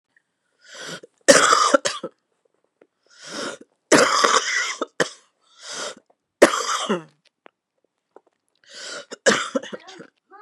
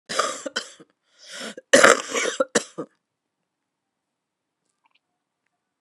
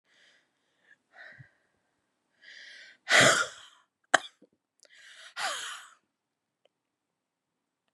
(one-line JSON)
{"three_cough_length": "10.4 s", "three_cough_amplitude": 32768, "three_cough_signal_mean_std_ratio": 0.36, "cough_length": "5.8 s", "cough_amplitude": 32768, "cough_signal_mean_std_ratio": 0.27, "exhalation_length": "7.9 s", "exhalation_amplitude": 23500, "exhalation_signal_mean_std_ratio": 0.22, "survey_phase": "beta (2021-08-13 to 2022-03-07)", "age": "45-64", "gender": "Female", "wearing_mask": "No", "symptom_cough_any": true, "symptom_new_continuous_cough": true, "symptom_runny_or_blocked_nose": true, "symptom_shortness_of_breath": true, "symptom_sore_throat": true, "symptom_fatigue": true, "symptom_headache": true, "symptom_change_to_sense_of_smell_or_taste": true, "symptom_loss_of_taste": true, "smoker_status": "Never smoked", "respiratory_condition_asthma": true, "respiratory_condition_other": false, "recruitment_source": "Test and Trace", "submission_delay": "5 days", "covid_test_method": "RT-qPCR"}